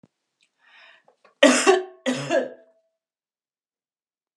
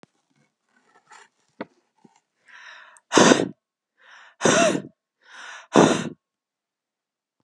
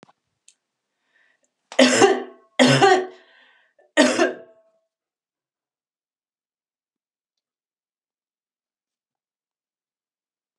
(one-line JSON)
{"cough_length": "4.4 s", "cough_amplitude": 31895, "cough_signal_mean_std_ratio": 0.3, "exhalation_length": "7.4 s", "exhalation_amplitude": 32102, "exhalation_signal_mean_std_ratio": 0.28, "three_cough_length": "10.6 s", "three_cough_amplitude": 31333, "three_cough_signal_mean_std_ratio": 0.26, "survey_phase": "beta (2021-08-13 to 2022-03-07)", "age": "45-64", "gender": "Female", "wearing_mask": "No", "symptom_none": true, "smoker_status": "Never smoked", "respiratory_condition_asthma": false, "respiratory_condition_other": false, "recruitment_source": "REACT", "submission_delay": "2 days", "covid_test_result": "Negative", "covid_test_method": "RT-qPCR", "influenza_a_test_result": "Unknown/Void", "influenza_b_test_result": "Unknown/Void"}